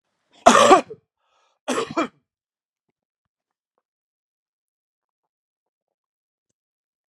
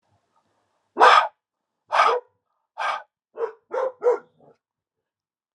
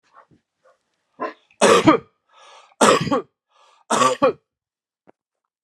cough_length: 7.1 s
cough_amplitude: 32768
cough_signal_mean_std_ratio: 0.2
exhalation_length: 5.5 s
exhalation_amplitude: 28803
exhalation_signal_mean_std_ratio: 0.33
three_cough_length: 5.6 s
three_cough_amplitude: 32767
three_cough_signal_mean_std_ratio: 0.35
survey_phase: alpha (2021-03-01 to 2021-08-12)
age: 45-64
gender: Male
wearing_mask: 'No'
symptom_none: true
smoker_status: Ex-smoker
respiratory_condition_asthma: false
respiratory_condition_other: false
recruitment_source: REACT
submission_delay: 2 days
covid_test_result: Negative
covid_test_method: RT-qPCR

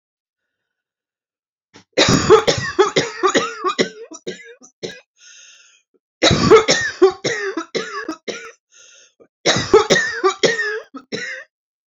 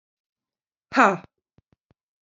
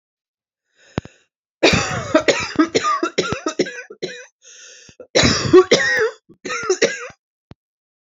three_cough_length: 11.9 s
three_cough_amplitude: 32138
three_cough_signal_mean_std_ratio: 0.45
exhalation_length: 2.2 s
exhalation_amplitude: 27014
exhalation_signal_mean_std_ratio: 0.21
cough_length: 8.0 s
cough_amplitude: 32764
cough_signal_mean_std_ratio: 0.46
survey_phase: beta (2021-08-13 to 2022-03-07)
age: 45-64
gender: Female
wearing_mask: 'No'
symptom_none: true
smoker_status: Never smoked
respiratory_condition_asthma: false
respiratory_condition_other: false
recruitment_source: REACT
submission_delay: 1 day
covid_test_result: Negative
covid_test_method: RT-qPCR
influenza_a_test_result: Unknown/Void
influenza_b_test_result: Unknown/Void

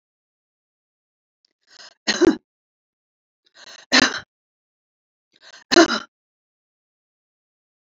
three_cough_length: 7.9 s
three_cough_amplitude: 29018
three_cough_signal_mean_std_ratio: 0.21
survey_phase: beta (2021-08-13 to 2022-03-07)
age: 45-64
gender: Female
wearing_mask: 'No'
symptom_none: true
smoker_status: Never smoked
respiratory_condition_asthma: false
respiratory_condition_other: false
recruitment_source: REACT
submission_delay: 1 day
covid_test_result: Negative
covid_test_method: RT-qPCR
influenza_a_test_result: Negative
influenza_b_test_result: Negative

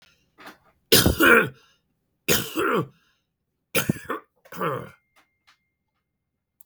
three_cough_length: 6.7 s
three_cough_amplitude: 28018
three_cough_signal_mean_std_ratio: 0.34
survey_phase: beta (2021-08-13 to 2022-03-07)
age: 65+
gender: Male
wearing_mask: 'No'
symptom_none: true
smoker_status: Never smoked
respiratory_condition_asthma: false
respiratory_condition_other: false
recruitment_source: REACT
submission_delay: 1 day
covid_test_result: Negative
covid_test_method: RT-qPCR
influenza_a_test_result: Negative
influenza_b_test_result: Negative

